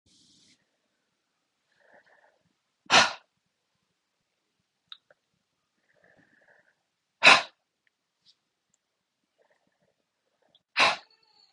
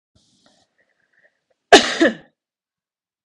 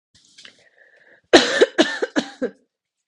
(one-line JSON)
{"exhalation_length": "11.5 s", "exhalation_amplitude": 25138, "exhalation_signal_mean_std_ratio": 0.16, "cough_length": "3.2 s", "cough_amplitude": 32768, "cough_signal_mean_std_ratio": 0.22, "three_cough_length": "3.1 s", "three_cough_amplitude": 32768, "three_cough_signal_mean_std_ratio": 0.32, "survey_phase": "beta (2021-08-13 to 2022-03-07)", "age": "18-44", "gender": "Female", "wearing_mask": "No", "symptom_runny_or_blocked_nose": true, "symptom_fatigue": true, "symptom_other": true, "smoker_status": "Ex-smoker", "respiratory_condition_asthma": false, "respiratory_condition_other": false, "recruitment_source": "Test and Trace", "submission_delay": "1 day", "covid_test_result": "Positive", "covid_test_method": "LFT"}